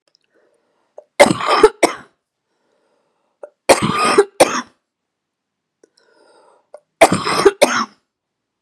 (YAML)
three_cough_length: 8.6 s
three_cough_amplitude: 32768
three_cough_signal_mean_std_ratio: 0.33
survey_phase: beta (2021-08-13 to 2022-03-07)
age: 45-64
gender: Female
wearing_mask: 'No'
symptom_none: true
smoker_status: Never smoked
respiratory_condition_asthma: true
respiratory_condition_other: true
recruitment_source: REACT
submission_delay: 2 days
covid_test_result: Negative
covid_test_method: RT-qPCR
influenza_a_test_result: Negative
influenza_b_test_result: Negative